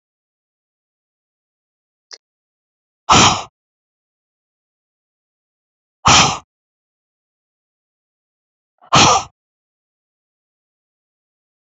{"exhalation_length": "11.8 s", "exhalation_amplitude": 32686, "exhalation_signal_mean_std_ratio": 0.22, "survey_phase": "alpha (2021-03-01 to 2021-08-12)", "age": "45-64", "gender": "Female", "wearing_mask": "No", "symptom_cough_any": true, "symptom_fatigue": true, "symptom_onset": "12 days", "smoker_status": "Never smoked", "respiratory_condition_asthma": true, "respiratory_condition_other": false, "recruitment_source": "REACT", "submission_delay": "3 days", "covid_test_result": "Negative", "covid_test_method": "RT-qPCR"}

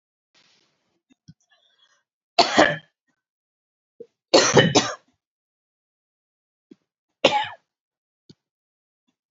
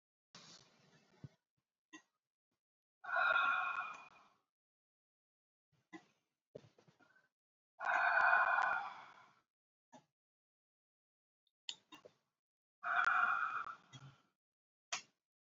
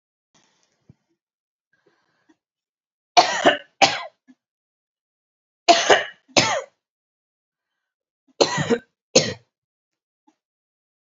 {"three_cough_length": "9.3 s", "three_cough_amplitude": 29397, "three_cough_signal_mean_std_ratio": 0.24, "exhalation_length": "15.5 s", "exhalation_amplitude": 3772, "exhalation_signal_mean_std_ratio": 0.35, "cough_length": "11.0 s", "cough_amplitude": 29796, "cough_signal_mean_std_ratio": 0.26, "survey_phase": "beta (2021-08-13 to 2022-03-07)", "age": "18-44", "gender": "Female", "wearing_mask": "No", "symptom_none": true, "smoker_status": "Never smoked", "respiratory_condition_asthma": false, "respiratory_condition_other": false, "recruitment_source": "REACT", "submission_delay": "2 days", "covid_test_result": "Negative", "covid_test_method": "RT-qPCR", "influenza_a_test_result": "Negative", "influenza_b_test_result": "Negative"}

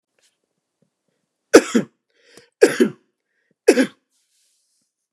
{"three_cough_length": "5.1 s", "three_cough_amplitude": 32768, "three_cough_signal_mean_std_ratio": 0.23, "survey_phase": "beta (2021-08-13 to 2022-03-07)", "age": "45-64", "gender": "Male", "wearing_mask": "No", "symptom_abdominal_pain": true, "smoker_status": "Ex-smoker", "respiratory_condition_asthma": false, "respiratory_condition_other": false, "recruitment_source": "REACT", "submission_delay": "1 day", "covid_test_result": "Negative", "covid_test_method": "RT-qPCR"}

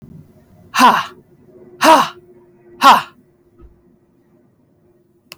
{"exhalation_length": "5.4 s", "exhalation_amplitude": 32768, "exhalation_signal_mean_std_ratio": 0.31, "survey_phase": "alpha (2021-03-01 to 2021-08-12)", "age": "18-44", "gender": "Female", "wearing_mask": "No", "symptom_fatigue": true, "symptom_fever_high_temperature": true, "symptom_headache": true, "smoker_status": "Never smoked", "respiratory_condition_asthma": false, "respiratory_condition_other": false, "recruitment_source": "Test and Trace", "submission_delay": "1 day", "covid_test_result": "Positive", "covid_test_method": "RT-qPCR", "covid_ct_value": 28.2, "covid_ct_gene": "ORF1ab gene", "covid_ct_mean": 29.0, "covid_viral_load": "300 copies/ml", "covid_viral_load_category": "Minimal viral load (< 10K copies/ml)"}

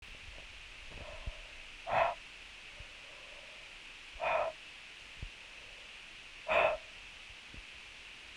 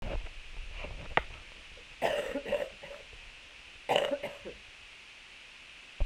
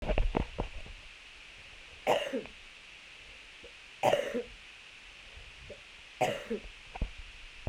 {"exhalation_length": "8.4 s", "exhalation_amplitude": 4720, "exhalation_signal_mean_std_ratio": 0.51, "cough_length": "6.1 s", "cough_amplitude": 12679, "cough_signal_mean_std_ratio": 0.55, "three_cough_length": "7.7 s", "three_cough_amplitude": 9504, "three_cough_signal_mean_std_ratio": 0.49, "survey_phase": "beta (2021-08-13 to 2022-03-07)", "age": "18-44", "gender": "Female", "wearing_mask": "No", "symptom_cough_any": true, "symptom_runny_or_blocked_nose": true, "symptom_fatigue": true, "symptom_fever_high_temperature": true, "symptom_other": true, "symptom_onset": "2 days", "smoker_status": "Current smoker (11 or more cigarettes per day)", "respiratory_condition_asthma": false, "respiratory_condition_other": false, "recruitment_source": "Test and Trace", "submission_delay": "1 day", "covid_test_result": "Positive", "covid_test_method": "RT-qPCR", "covid_ct_value": 16.6, "covid_ct_gene": "ORF1ab gene", "covid_ct_mean": 17.2, "covid_viral_load": "2300000 copies/ml", "covid_viral_load_category": "High viral load (>1M copies/ml)"}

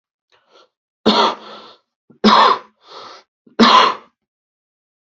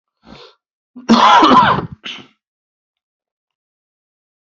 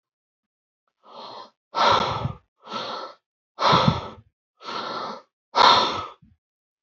{"three_cough_length": "5.0 s", "three_cough_amplitude": 29484, "three_cough_signal_mean_std_ratio": 0.37, "cough_length": "4.5 s", "cough_amplitude": 30496, "cough_signal_mean_std_ratio": 0.35, "exhalation_length": "6.8 s", "exhalation_amplitude": 24588, "exhalation_signal_mean_std_ratio": 0.41, "survey_phase": "beta (2021-08-13 to 2022-03-07)", "age": "45-64", "gender": "Male", "wearing_mask": "No", "symptom_cough_any": true, "symptom_runny_or_blocked_nose": true, "symptom_headache": true, "smoker_status": "Never smoked", "respiratory_condition_asthma": false, "respiratory_condition_other": false, "recruitment_source": "Test and Trace", "submission_delay": "2 days", "covid_test_result": "Positive", "covid_test_method": "RT-qPCR", "covid_ct_value": 16.7, "covid_ct_gene": "N gene"}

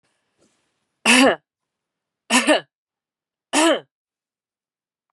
{"three_cough_length": "5.1 s", "three_cough_amplitude": 27732, "three_cough_signal_mean_std_ratio": 0.32, "survey_phase": "beta (2021-08-13 to 2022-03-07)", "age": "45-64", "gender": "Female", "wearing_mask": "Yes", "symptom_runny_or_blocked_nose": true, "symptom_sore_throat": true, "symptom_change_to_sense_of_smell_or_taste": true, "symptom_loss_of_taste": true, "symptom_onset": "2 days", "smoker_status": "Never smoked", "respiratory_condition_asthma": false, "respiratory_condition_other": false, "recruitment_source": "Test and Trace", "submission_delay": "1 day", "covid_test_result": "Positive", "covid_test_method": "RT-qPCR", "covid_ct_value": 15.3, "covid_ct_gene": "ORF1ab gene", "covid_ct_mean": 15.7, "covid_viral_load": "6900000 copies/ml", "covid_viral_load_category": "High viral load (>1M copies/ml)"}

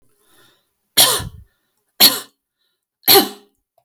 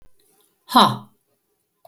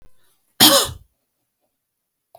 {"three_cough_length": "3.8 s", "three_cough_amplitude": 32768, "three_cough_signal_mean_std_ratio": 0.31, "exhalation_length": "1.9 s", "exhalation_amplitude": 32427, "exhalation_signal_mean_std_ratio": 0.26, "cough_length": "2.4 s", "cough_amplitude": 32767, "cough_signal_mean_std_ratio": 0.27, "survey_phase": "alpha (2021-03-01 to 2021-08-12)", "age": "65+", "gender": "Female", "wearing_mask": "No", "symptom_none": true, "smoker_status": "Never smoked", "respiratory_condition_asthma": false, "respiratory_condition_other": false, "recruitment_source": "REACT", "submission_delay": "1 day", "covid_test_result": "Negative", "covid_test_method": "RT-qPCR"}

